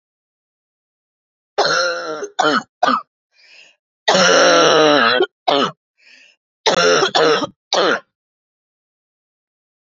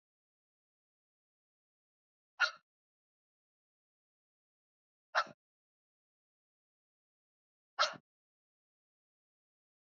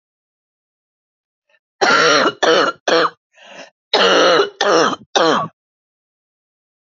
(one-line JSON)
{"three_cough_length": "9.8 s", "three_cough_amplitude": 31131, "three_cough_signal_mean_std_ratio": 0.49, "exhalation_length": "9.8 s", "exhalation_amplitude": 4026, "exhalation_signal_mean_std_ratio": 0.13, "cough_length": "6.9 s", "cough_amplitude": 29523, "cough_signal_mean_std_ratio": 0.49, "survey_phase": "beta (2021-08-13 to 2022-03-07)", "age": "45-64", "gender": "Female", "wearing_mask": "No", "symptom_cough_any": true, "symptom_fatigue": true, "symptom_headache": true, "symptom_onset": "3 days", "smoker_status": "Never smoked", "respiratory_condition_asthma": false, "respiratory_condition_other": false, "recruitment_source": "Test and Trace", "submission_delay": "1 day", "covid_test_result": "Positive", "covid_test_method": "RT-qPCR", "covid_ct_value": 27.2, "covid_ct_gene": "ORF1ab gene"}